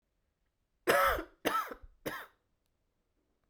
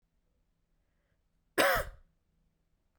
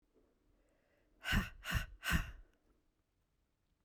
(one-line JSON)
{"three_cough_length": "3.5 s", "three_cough_amplitude": 8951, "three_cough_signal_mean_std_ratio": 0.35, "cough_length": "3.0 s", "cough_amplitude": 7973, "cough_signal_mean_std_ratio": 0.25, "exhalation_length": "3.8 s", "exhalation_amplitude": 3382, "exhalation_signal_mean_std_ratio": 0.34, "survey_phase": "beta (2021-08-13 to 2022-03-07)", "age": "18-44", "gender": "Female", "wearing_mask": "No", "symptom_cough_any": true, "symptom_runny_or_blocked_nose": true, "symptom_fatigue": true, "symptom_headache": true, "symptom_change_to_sense_of_smell_or_taste": true, "symptom_loss_of_taste": true, "symptom_other": true, "smoker_status": "Never smoked", "respiratory_condition_asthma": false, "respiratory_condition_other": false, "recruitment_source": "Test and Trace", "submission_delay": "2 days", "covid_test_result": "Positive", "covid_test_method": "LFT"}